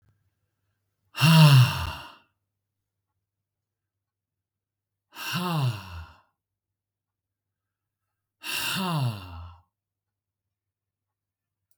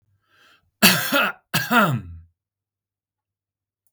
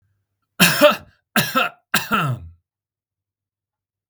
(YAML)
exhalation_length: 11.8 s
exhalation_amplitude: 18182
exhalation_signal_mean_std_ratio: 0.29
cough_length: 3.9 s
cough_amplitude: 32768
cough_signal_mean_std_ratio: 0.37
three_cough_length: 4.1 s
three_cough_amplitude: 32768
three_cough_signal_mean_std_ratio: 0.37
survey_phase: beta (2021-08-13 to 2022-03-07)
age: 45-64
gender: Male
wearing_mask: 'No'
symptom_none: true
smoker_status: Never smoked
respiratory_condition_asthma: false
respiratory_condition_other: false
recruitment_source: REACT
submission_delay: 2 days
covid_test_result: Negative
covid_test_method: RT-qPCR
influenza_a_test_result: Negative
influenza_b_test_result: Negative